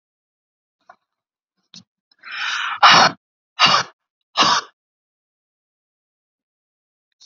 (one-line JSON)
{"exhalation_length": "7.3 s", "exhalation_amplitude": 32768, "exhalation_signal_mean_std_ratio": 0.29, "survey_phase": "beta (2021-08-13 to 2022-03-07)", "age": "45-64", "gender": "Female", "wearing_mask": "No", "symptom_none": true, "symptom_onset": "2 days", "smoker_status": "Ex-smoker", "respiratory_condition_asthma": false, "respiratory_condition_other": false, "recruitment_source": "REACT", "submission_delay": "5 days", "covid_test_result": "Negative", "covid_test_method": "RT-qPCR"}